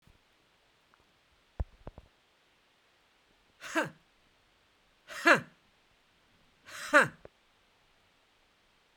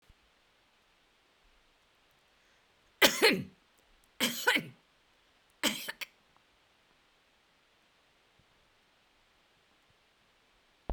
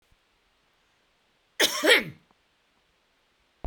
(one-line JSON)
{"exhalation_length": "9.0 s", "exhalation_amplitude": 11972, "exhalation_signal_mean_std_ratio": 0.2, "three_cough_length": "10.9 s", "three_cough_amplitude": 12159, "three_cough_signal_mean_std_ratio": 0.22, "cough_length": "3.7 s", "cough_amplitude": 18196, "cough_signal_mean_std_ratio": 0.25, "survey_phase": "beta (2021-08-13 to 2022-03-07)", "age": "65+", "gender": "Female", "wearing_mask": "No", "symptom_none": true, "smoker_status": "Never smoked", "respiratory_condition_asthma": false, "respiratory_condition_other": false, "recruitment_source": "REACT", "submission_delay": "1 day", "covid_test_result": "Negative", "covid_test_method": "RT-qPCR"}